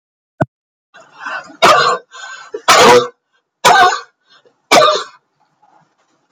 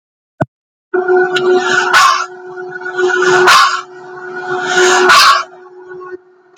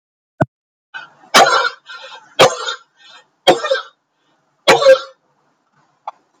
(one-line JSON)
{"cough_length": "6.3 s", "cough_amplitude": 32768, "cough_signal_mean_std_ratio": 0.43, "exhalation_length": "6.6 s", "exhalation_amplitude": 32768, "exhalation_signal_mean_std_ratio": 0.71, "three_cough_length": "6.4 s", "three_cough_amplitude": 32767, "three_cough_signal_mean_std_ratio": 0.35, "survey_phase": "beta (2021-08-13 to 2022-03-07)", "age": "65+", "gender": "Female", "wearing_mask": "No", "symptom_none": true, "symptom_onset": "5 days", "smoker_status": "Never smoked", "respiratory_condition_asthma": false, "respiratory_condition_other": false, "recruitment_source": "REACT", "submission_delay": "4 days", "covid_test_result": "Negative", "covid_test_method": "RT-qPCR", "influenza_a_test_result": "Negative", "influenza_b_test_result": "Negative"}